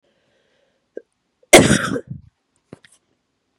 {"cough_length": "3.6 s", "cough_amplitude": 32768, "cough_signal_mean_std_ratio": 0.24, "survey_phase": "beta (2021-08-13 to 2022-03-07)", "age": "45-64", "gender": "Female", "wearing_mask": "No", "symptom_cough_any": true, "symptom_runny_or_blocked_nose": true, "symptom_sore_throat": true, "symptom_fatigue": true, "symptom_fever_high_temperature": true, "symptom_headache": true, "symptom_change_to_sense_of_smell_or_taste": true, "symptom_other": true, "symptom_onset": "4 days", "smoker_status": "Never smoked", "respiratory_condition_asthma": false, "respiratory_condition_other": false, "recruitment_source": "Test and Trace", "submission_delay": "2 days", "covid_test_result": "Positive", "covid_test_method": "RT-qPCR", "covid_ct_value": 25.3, "covid_ct_gene": "N gene"}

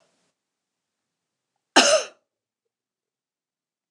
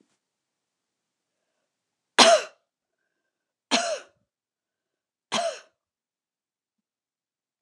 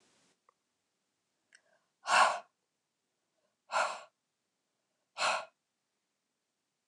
{"cough_length": "3.9 s", "cough_amplitude": 29147, "cough_signal_mean_std_ratio": 0.2, "three_cough_length": "7.6 s", "three_cough_amplitude": 29203, "three_cough_signal_mean_std_ratio": 0.2, "exhalation_length": "6.9 s", "exhalation_amplitude": 6773, "exhalation_signal_mean_std_ratio": 0.25, "survey_phase": "beta (2021-08-13 to 2022-03-07)", "age": "45-64", "gender": "Female", "wearing_mask": "No", "symptom_none": true, "smoker_status": "Never smoked", "respiratory_condition_asthma": false, "respiratory_condition_other": false, "recruitment_source": "REACT", "submission_delay": "7 days", "covid_test_result": "Negative", "covid_test_method": "RT-qPCR"}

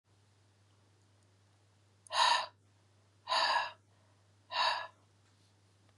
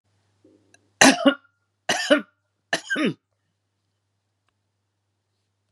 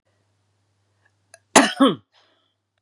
{"exhalation_length": "6.0 s", "exhalation_amplitude": 5500, "exhalation_signal_mean_std_ratio": 0.36, "three_cough_length": "5.7 s", "three_cough_amplitude": 32768, "three_cough_signal_mean_std_ratio": 0.26, "cough_length": "2.8 s", "cough_amplitude": 32768, "cough_signal_mean_std_ratio": 0.25, "survey_phase": "beta (2021-08-13 to 2022-03-07)", "age": "45-64", "gender": "Female", "wearing_mask": "No", "symptom_none": true, "smoker_status": "Ex-smoker", "respiratory_condition_asthma": false, "respiratory_condition_other": false, "recruitment_source": "REACT", "submission_delay": "1 day", "covid_test_result": "Negative", "covid_test_method": "RT-qPCR", "influenza_a_test_result": "Negative", "influenza_b_test_result": "Negative"}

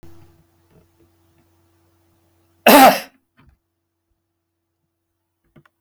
{"cough_length": "5.8 s", "cough_amplitude": 32768, "cough_signal_mean_std_ratio": 0.2, "survey_phase": "beta (2021-08-13 to 2022-03-07)", "age": "65+", "gender": "Male", "wearing_mask": "No", "symptom_none": true, "smoker_status": "Never smoked", "respiratory_condition_asthma": false, "respiratory_condition_other": false, "recruitment_source": "REACT", "submission_delay": "3 days", "covid_test_result": "Negative", "covid_test_method": "RT-qPCR", "influenza_a_test_result": "Negative", "influenza_b_test_result": "Negative"}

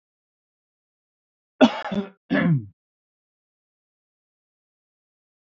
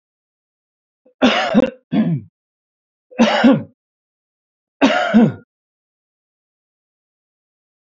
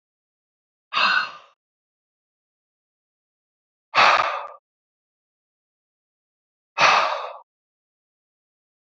{"cough_length": "5.5 s", "cough_amplitude": 24226, "cough_signal_mean_std_ratio": 0.24, "three_cough_length": "7.9 s", "three_cough_amplitude": 30393, "three_cough_signal_mean_std_ratio": 0.36, "exhalation_length": "9.0 s", "exhalation_amplitude": 26655, "exhalation_signal_mean_std_ratio": 0.28, "survey_phase": "beta (2021-08-13 to 2022-03-07)", "age": "65+", "gender": "Male", "wearing_mask": "No", "symptom_none": true, "smoker_status": "Never smoked", "respiratory_condition_asthma": false, "respiratory_condition_other": false, "recruitment_source": "REACT", "submission_delay": "2 days", "covid_test_result": "Negative", "covid_test_method": "RT-qPCR"}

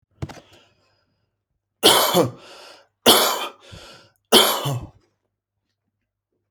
{"three_cough_length": "6.5 s", "three_cough_amplitude": 32768, "three_cough_signal_mean_std_ratio": 0.35, "survey_phase": "alpha (2021-03-01 to 2021-08-12)", "age": "18-44", "gender": "Male", "wearing_mask": "No", "symptom_none": true, "smoker_status": "Ex-smoker", "respiratory_condition_asthma": false, "respiratory_condition_other": false, "recruitment_source": "REACT", "submission_delay": "2 days", "covid_test_result": "Negative", "covid_test_method": "RT-qPCR"}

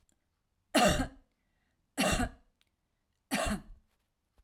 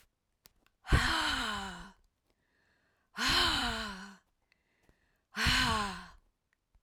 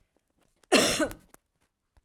{"three_cough_length": "4.4 s", "three_cough_amplitude": 7883, "three_cough_signal_mean_std_ratio": 0.37, "exhalation_length": "6.8 s", "exhalation_amplitude": 6498, "exhalation_signal_mean_std_ratio": 0.47, "cough_length": "2.0 s", "cough_amplitude": 14616, "cough_signal_mean_std_ratio": 0.33, "survey_phase": "alpha (2021-03-01 to 2021-08-12)", "age": "45-64", "gender": "Female", "wearing_mask": "No", "symptom_none": true, "smoker_status": "Ex-smoker", "respiratory_condition_asthma": false, "respiratory_condition_other": false, "recruitment_source": "REACT", "submission_delay": "5 days", "covid_test_result": "Negative", "covid_test_method": "RT-qPCR"}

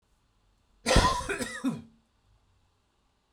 {"cough_length": "3.3 s", "cough_amplitude": 14066, "cough_signal_mean_std_ratio": 0.35, "survey_phase": "beta (2021-08-13 to 2022-03-07)", "age": "18-44", "gender": "Male", "wearing_mask": "No", "symptom_none": true, "smoker_status": "Current smoker (e-cigarettes or vapes only)", "respiratory_condition_asthma": false, "respiratory_condition_other": false, "recruitment_source": "REACT", "submission_delay": "2 days", "covid_test_result": "Negative", "covid_test_method": "RT-qPCR", "influenza_a_test_result": "Negative", "influenza_b_test_result": "Negative"}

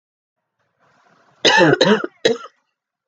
{"three_cough_length": "3.1 s", "three_cough_amplitude": 31216, "three_cough_signal_mean_std_ratio": 0.38, "survey_phase": "beta (2021-08-13 to 2022-03-07)", "age": "18-44", "gender": "Female", "wearing_mask": "No", "symptom_cough_any": true, "symptom_runny_or_blocked_nose": true, "symptom_sore_throat": true, "symptom_fatigue": true, "symptom_onset": "4 days", "smoker_status": "Never smoked", "respiratory_condition_asthma": true, "respiratory_condition_other": false, "recruitment_source": "Test and Trace", "submission_delay": "2 days", "covid_test_result": "Positive", "covid_test_method": "RT-qPCR", "covid_ct_value": 20.6, "covid_ct_gene": "ORF1ab gene", "covid_ct_mean": 20.7, "covid_viral_load": "160000 copies/ml", "covid_viral_load_category": "Low viral load (10K-1M copies/ml)"}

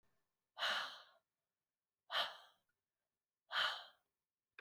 {"exhalation_length": "4.6 s", "exhalation_amplitude": 1683, "exhalation_signal_mean_std_ratio": 0.34, "survey_phase": "beta (2021-08-13 to 2022-03-07)", "age": "45-64", "gender": "Female", "wearing_mask": "No", "symptom_none": true, "smoker_status": "Never smoked", "respiratory_condition_asthma": false, "respiratory_condition_other": false, "recruitment_source": "REACT", "submission_delay": "1 day", "covid_test_result": "Negative", "covid_test_method": "RT-qPCR"}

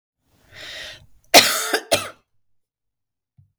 {"cough_length": "3.6 s", "cough_amplitude": 32768, "cough_signal_mean_std_ratio": 0.28, "survey_phase": "beta (2021-08-13 to 2022-03-07)", "age": "45-64", "gender": "Female", "wearing_mask": "No", "symptom_none": true, "smoker_status": "Ex-smoker", "respiratory_condition_asthma": false, "respiratory_condition_other": false, "recruitment_source": "REACT", "submission_delay": "1 day", "covid_test_result": "Negative", "covid_test_method": "RT-qPCR", "influenza_a_test_result": "Negative", "influenza_b_test_result": "Negative"}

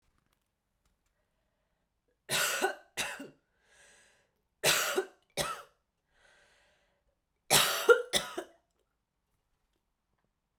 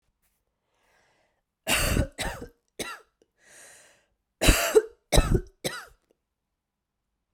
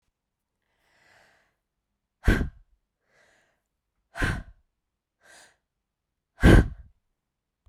{"three_cough_length": "10.6 s", "three_cough_amplitude": 11819, "three_cough_signal_mean_std_ratio": 0.29, "cough_length": "7.3 s", "cough_amplitude": 26275, "cough_signal_mean_std_ratio": 0.31, "exhalation_length": "7.7 s", "exhalation_amplitude": 24440, "exhalation_signal_mean_std_ratio": 0.21, "survey_phase": "beta (2021-08-13 to 2022-03-07)", "age": "18-44", "gender": "Female", "wearing_mask": "No", "symptom_cough_any": true, "symptom_runny_or_blocked_nose": true, "symptom_sore_throat": true, "symptom_fatigue": true, "symptom_headache": true, "symptom_change_to_sense_of_smell_or_taste": true, "symptom_other": true, "symptom_onset": "2 days", "smoker_status": "Current smoker (e-cigarettes or vapes only)", "respiratory_condition_asthma": false, "respiratory_condition_other": false, "recruitment_source": "Test and Trace", "submission_delay": "1 day", "covid_test_result": "Positive", "covid_test_method": "RT-qPCR", "covid_ct_value": 13.9, "covid_ct_gene": "ORF1ab gene", "covid_ct_mean": 14.1, "covid_viral_load": "24000000 copies/ml", "covid_viral_load_category": "High viral load (>1M copies/ml)"}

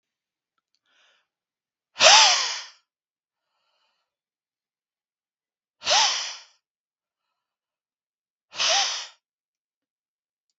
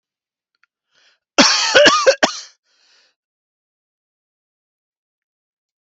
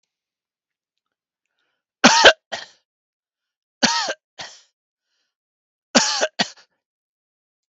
{"exhalation_length": "10.6 s", "exhalation_amplitude": 32766, "exhalation_signal_mean_std_ratio": 0.26, "cough_length": "5.8 s", "cough_amplitude": 32768, "cough_signal_mean_std_ratio": 0.29, "three_cough_length": "7.7 s", "three_cough_amplitude": 32768, "three_cough_signal_mean_std_ratio": 0.24, "survey_phase": "beta (2021-08-13 to 2022-03-07)", "age": "45-64", "gender": "Male", "wearing_mask": "No", "symptom_none": true, "smoker_status": "Never smoked", "respiratory_condition_asthma": true, "respiratory_condition_other": false, "recruitment_source": "REACT", "submission_delay": "0 days", "covid_test_result": "Negative", "covid_test_method": "RT-qPCR", "influenza_a_test_result": "Negative", "influenza_b_test_result": "Negative"}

